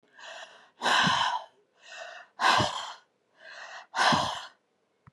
{"exhalation_length": "5.1 s", "exhalation_amplitude": 11311, "exhalation_signal_mean_std_ratio": 0.48, "survey_phase": "beta (2021-08-13 to 2022-03-07)", "age": "45-64", "gender": "Female", "wearing_mask": "Yes", "symptom_none": true, "smoker_status": "Never smoked", "respiratory_condition_asthma": false, "respiratory_condition_other": false, "recruitment_source": "REACT", "submission_delay": "3 days", "covid_test_result": "Negative", "covid_test_method": "RT-qPCR", "influenza_a_test_result": "Negative", "influenza_b_test_result": "Negative"}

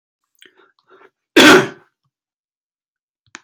{"cough_length": "3.4 s", "cough_amplitude": 32768, "cough_signal_mean_std_ratio": 0.25, "survey_phase": "alpha (2021-03-01 to 2021-08-12)", "age": "45-64", "gender": "Male", "wearing_mask": "No", "symptom_none": true, "smoker_status": "Never smoked", "respiratory_condition_asthma": false, "respiratory_condition_other": false, "recruitment_source": "REACT", "submission_delay": "3 days", "covid_test_result": "Negative", "covid_test_method": "RT-qPCR"}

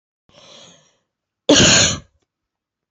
{"cough_length": "2.9 s", "cough_amplitude": 32768, "cough_signal_mean_std_ratio": 0.34, "survey_phase": "beta (2021-08-13 to 2022-03-07)", "age": "18-44", "gender": "Female", "wearing_mask": "No", "symptom_cough_any": true, "symptom_sore_throat": true, "symptom_fatigue": true, "symptom_fever_high_temperature": true, "symptom_headache": true, "symptom_other": true, "symptom_onset": "3 days", "smoker_status": "Current smoker (e-cigarettes or vapes only)", "respiratory_condition_asthma": true, "respiratory_condition_other": false, "recruitment_source": "Test and Trace", "submission_delay": "2 days", "covid_test_result": "Positive", "covid_test_method": "RT-qPCR", "covid_ct_value": 17.7, "covid_ct_gene": "ORF1ab gene", "covid_ct_mean": 17.9, "covid_viral_load": "1300000 copies/ml", "covid_viral_load_category": "High viral load (>1M copies/ml)"}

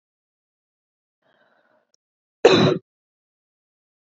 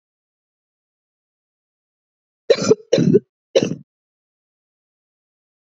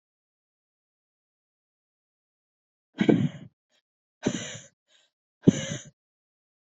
{"cough_length": "4.2 s", "cough_amplitude": 29042, "cough_signal_mean_std_ratio": 0.21, "three_cough_length": "5.6 s", "three_cough_amplitude": 27370, "three_cough_signal_mean_std_ratio": 0.24, "exhalation_length": "6.7 s", "exhalation_amplitude": 20068, "exhalation_signal_mean_std_ratio": 0.21, "survey_phase": "beta (2021-08-13 to 2022-03-07)", "age": "18-44", "gender": "Female", "wearing_mask": "No", "symptom_cough_any": true, "symptom_runny_or_blocked_nose": true, "symptom_sore_throat": true, "symptom_headache": true, "symptom_onset": "3 days", "smoker_status": "Never smoked", "respiratory_condition_asthma": false, "respiratory_condition_other": false, "recruitment_source": "Test and Trace", "submission_delay": "2 days", "covid_test_result": "Positive", "covid_test_method": "RT-qPCR", "covid_ct_value": 19.2, "covid_ct_gene": "ORF1ab gene", "covid_ct_mean": 19.5, "covid_viral_load": "400000 copies/ml", "covid_viral_load_category": "Low viral load (10K-1M copies/ml)"}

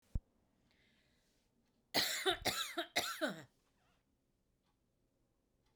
{"cough_length": "5.8 s", "cough_amplitude": 3467, "cough_signal_mean_std_ratio": 0.35, "survey_phase": "beta (2021-08-13 to 2022-03-07)", "age": "45-64", "gender": "Female", "wearing_mask": "No", "symptom_cough_any": true, "symptom_runny_or_blocked_nose": true, "symptom_fatigue": true, "symptom_headache": true, "symptom_onset": "3 days", "smoker_status": "Never smoked", "respiratory_condition_asthma": false, "respiratory_condition_other": false, "recruitment_source": "Test and Trace", "submission_delay": "1 day", "covid_test_result": "Positive", "covid_test_method": "ePCR"}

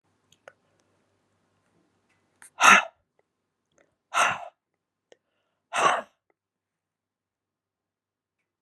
{"exhalation_length": "8.6 s", "exhalation_amplitude": 28864, "exhalation_signal_mean_std_ratio": 0.21, "survey_phase": "beta (2021-08-13 to 2022-03-07)", "age": "65+", "gender": "Female", "wearing_mask": "No", "symptom_none": true, "smoker_status": "Ex-smoker", "respiratory_condition_asthma": false, "respiratory_condition_other": false, "recruitment_source": "REACT", "submission_delay": "3 days", "covid_test_result": "Negative", "covid_test_method": "RT-qPCR", "influenza_a_test_result": "Negative", "influenza_b_test_result": "Negative"}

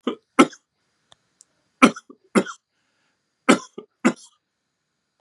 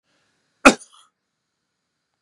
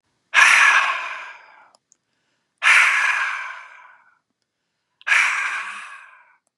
{"three_cough_length": "5.2 s", "three_cough_amplitude": 32767, "three_cough_signal_mean_std_ratio": 0.22, "cough_length": "2.2 s", "cough_amplitude": 32768, "cough_signal_mean_std_ratio": 0.14, "exhalation_length": "6.6 s", "exhalation_amplitude": 29666, "exhalation_signal_mean_std_ratio": 0.46, "survey_phase": "beta (2021-08-13 to 2022-03-07)", "age": "45-64", "gender": "Male", "wearing_mask": "No", "symptom_none": true, "smoker_status": "Never smoked", "respiratory_condition_asthma": false, "respiratory_condition_other": false, "recruitment_source": "REACT", "submission_delay": "5 days", "covid_test_result": "Negative", "covid_test_method": "RT-qPCR", "influenza_a_test_result": "Negative", "influenza_b_test_result": "Negative"}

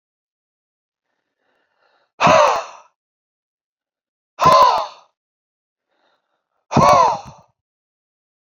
{"exhalation_length": "8.4 s", "exhalation_amplitude": 28078, "exhalation_signal_mean_std_ratio": 0.32, "survey_phase": "beta (2021-08-13 to 2022-03-07)", "age": "45-64", "gender": "Male", "wearing_mask": "No", "symptom_sore_throat": true, "symptom_fatigue": true, "symptom_headache": true, "symptom_onset": "13 days", "smoker_status": "Never smoked", "respiratory_condition_asthma": false, "respiratory_condition_other": false, "recruitment_source": "REACT", "submission_delay": "1 day", "covid_test_result": "Negative", "covid_test_method": "RT-qPCR", "influenza_a_test_result": "Unknown/Void", "influenza_b_test_result": "Unknown/Void"}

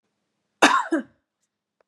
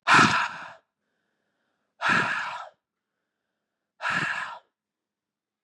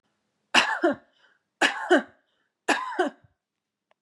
{"cough_length": "1.9 s", "cough_amplitude": 29443, "cough_signal_mean_std_ratio": 0.3, "exhalation_length": "5.6 s", "exhalation_amplitude": 18864, "exhalation_signal_mean_std_ratio": 0.37, "three_cough_length": "4.0 s", "three_cough_amplitude": 24801, "three_cough_signal_mean_std_ratio": 0.38, "survey_phase": "beta (2021-08-13 to 2022-03-07)", "age": "45-64", "gender": "Female", "wearing_mask": "No", "symptom_none": true, "smoker_status": "Never smoked", "respiratory_condition_asthma": true, "respiratory_condition_other": false, "recruitment_source": "REACT", "submission_delay": "2 days", "covid_test_result": "Negative", "covid_test_method": "RT-qPCR", "influenza_a_test_result": "Negative", "influenza_b_test_result": "Negative"}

